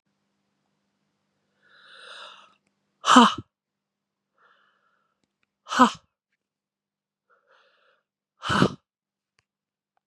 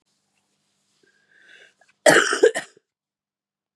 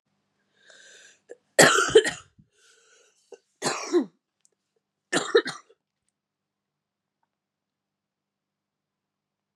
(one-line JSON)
{"exhalation_length": "10.1 s", "exhalation_amplitude": 32354, "exhalation_signal_mean_std_ratio": 0.19, "cough_length": "3.8 s", "cough_amplitude": 32652, "cough_signal_mean_std_ratio": 0.25, "three_cough_length": "9.6 s", "three_cough_amplitude": 27931, "three_cough_signal_mean_std_ratio": 0.23, "survey_phase": "beta (2021-08-13 to 2022-03-07)", "age": "18-44", "gender": "Female", "wearing_mask": "No", "symptom_cough_any": true, "symptom_new_continuous_cough": true, "symptom_runny_or_blocked_nose": true, "symptom_sore_throat": true, "symptom_diarrhoea": true, "symptom_fatigue": true, "symptom_headache": true, "symptom_change_to_sense_of_smell_or_taste": true, "symptom_onset": "6 days", "smoker_status": "Never smoked", "respiratory_condition_asthma": false, "respiratory_condition_other": false, "recruitment_source": "Test and Trace", "submission_delay": "2 days", "covid_test_result": "Positive", "covid_test_method": "RT-qPCR", "covid_ct_value": 21.8, "covid_ct_gene": "N gene"}